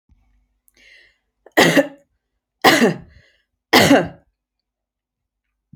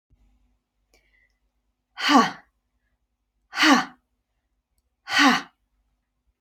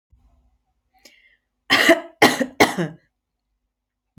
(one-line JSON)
{"three_cough_length": "5.8 s", "three_cough_amplitude": 31597, "three_cough_signal_mean_std_ratio": 0.31, "exhalation_length": "6.4 s", "exhalation_amplitude": 25507, "exhalation_signal_mean_std_ratio": 0.29, "cough_length": "4.2 s", "cough_amplitude": 32666, "cough_signal_mean_std_ratio": 0.31, "survey_phase": "alpha (2021-03-01 to 2021-08-12)", "age": "45-64", "gender": "Female", "wearing_mask": "No", "symptom_none": true, "smoker_status": "Never smoked", "respiratory_condition_asthma": false, "respiratory_condition_other": false, "recruitment_source": "REACT", "submission_delay": "1 day", "covid_test_result": "Negative", "covid_test_method": "RT-qPCR"}